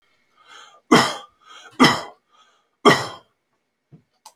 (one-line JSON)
{"three_cough_length": "4.4 s", "three_cough_amplitude": 28885, "three_cough_signal_mean_std_ratio": 0.29, "survey_phase": "alpha (2021-03-01 to 2021-08-12)", "age": "65+", "gender": "Male", "wearing_mask": "No", "symptom_none": true, "smoker_status": "Ex-smoker", "respiratory_condition_asthma": false, "respiratory_condition_other": false, "recruitment_source": "REACT", "submission_delay": "2 days", "covid_test_result": "Negative", "covid_test_method": "RT-qPCR"}